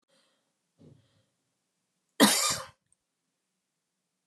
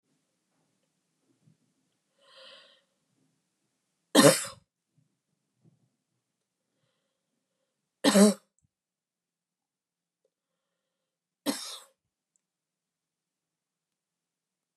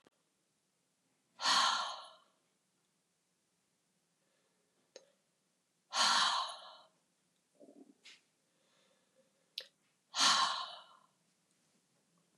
{
  "cough_length": "4.3 s",
  "cough_amplitude": 16052,
  "cough_signal_mean_std_ratio": 0.22,
  "three_cough_length": "14.8 s",
  "three_cough_amplitude": 20625,
  "three_cough_signal_mean_std_ratio": 0.16,
  "exhalation_length": "12.4 s",
  "exhalation_amplitude": 5428,
  "exhalation_signal_mean_std_ratio": 0.3,
  "survey_phase": "beta (2021-08-13 to 2022-03-07)",
  "age": "65+",
  "gender": "Female",
  "wearing_mask": "No",
  "symptom_none": true,
  "smoker_status": "Never smoked",
  "respiratory_condition_asthma": false,
  "respiratory_condition_other": false,
  "recruitment_source": "REACT",
  "submission_delay": "7 days",
  "covid_test_result": "Negative",
  "covid_test_method": "RT-qPCR"
}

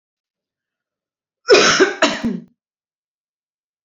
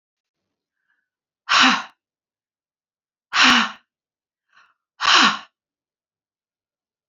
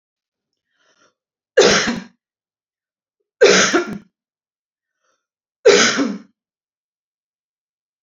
{
  "cough_length": "3.8 s",
  "cough_amplitude": 32413,
  "cough_signal_mean_std_ratio": 0.33,
  "exhalation_length": "7.1 s",
  "exhalation_amplitude": 29551,
  "exhalation_signal_mean_std_ratio": 0.29,
  "three_cough_length": "8.0 s",
  "three_cough_amplitude": 30869,
  "three_cough_signal_mean_std_ratio": 0.31,
  "survey_phase": "beta (2021-08-13 to 2022-03-07)",
  "age": "45-64",
  "gender": "Female",
  "wearing_mask": "No",
  "symptom_cough_any": true,
  "symptom_sore_throat": true,
  "symptom_fatigue": true,
  "smoker_status": "Never smoked",
  "respiratory_condition_asthma": false,
  "respiratory_condition_other": false,
  "recruitment_source": "Test and Trace",
  "submission_delay": "1 day",
  "covid_test_result": "Positive",
  "covid_test_method": "RT-qPCR",
  "covid_ct_value": 25.7,
  "covid_ct_gene": "ORF1ab gene",
  "covid_ct_mean": 26.3,
  "covid_viral_load": "2400 copies/ml",
  "covid_viral_load_category": "Minimal viral load (< 10K copies/ml)"
}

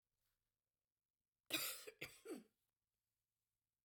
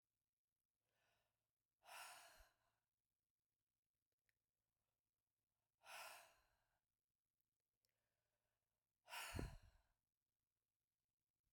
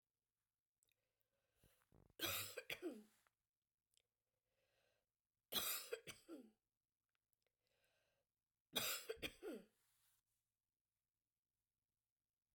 {
  "cough_length": "3.8 s",
  "cough_amplitude": 1187,
  "cough_signal_mean_std_ratio": 0.29,
  "exhalation_length": "11.5 s",
  "exhalation_amplitude": 532,
  "exhalation_signal_mean_std_ratio": 0.26,
  "three_cough_length": "12.5 s",
  "three_cough_amplitude": 1374,
  "three_cough_signal_mean_std_ratio": 0.3,
  "survey_phase": "beta (2021-08-13 to 2022-03-07)",
  "age": "45-64",
  "gender": "Female",
  "wearing_mask": "No",
  "symptom_none": true,
  "smoker_status": "Never smoked",
  "respiratory_condition_asthma": true,
  "respiratory_condition_other": true,
  "recruitment_source": "REACT",
  "submission_delay": "2 days",
  "covid_test_result": "Negative",
  "covid_test_method": "RT-qPCR"
}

